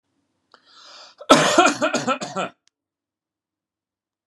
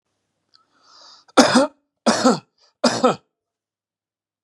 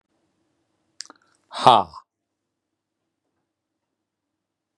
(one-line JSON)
{"cough_length": "4.3 s", "cough_amplitude": 32768, "cough_signal_mean_std_ratio": 0.34, "three_cough_length": "4.4 s", "three_cough_amplitude": 32767, "three_cough_signal_mean_std_ratio": 0.33, "exhalation_length": "4.8 s", "exhalation_amplitude": 32768, "exhalation_signal_mean_std_ratio": 0.15, "survey_phase": "beta (2021-08-13 to 2022-03-07)", "age": "45-64", "gender": "Male", "wearing_mask": "No", "symptom_none": true, "smoker_status": "Never smoked", "respiratory_condition_asthma": false, "respiratory_condition_other": false, "recruitment_source": "REACT", "submission_delay": "1 day", "covid_test_result": "Negative", "covid_test_method": "RT-qPCR"}